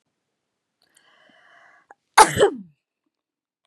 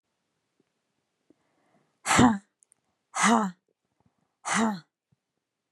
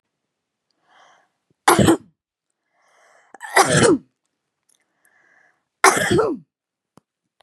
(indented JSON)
{
  "cough_length": "3.7 s",
  "cough_amplitude": 32767,
  "cough_signal_mean_std_ratio": 0.2,
  "exhalation_length": "5.7 s",
  "exhalation_amplitude": 17034,
  "exhalation_signal_mean_std_ratio": 0.3,
  "three_cough_length": "7.4 s",
  "three_cough_amplitude": 32767,
  "three_cough_signal_mean_std_ratio": 0.32,
  "survey_phase": "beta (2021-08-13 to 2022-03-07)",
  "age": "45-64",
  "gender": "Female",
  "wearing_mask": "No",
  "symptom_none": true,
  "smoker_status": "Never smoked",
  "respiratory_condition_asthma": false,
  "respiratory_condition_other": false,
  "recruitment_source": "REACT",
  "submission_delay": "3 days",
  "covid_test_result": "Negative",
  "covid_test_method": "RT-qPCR",
  "influenza_a_test_result": "Negative",
  "influenza_b_test_result": "Negative"
}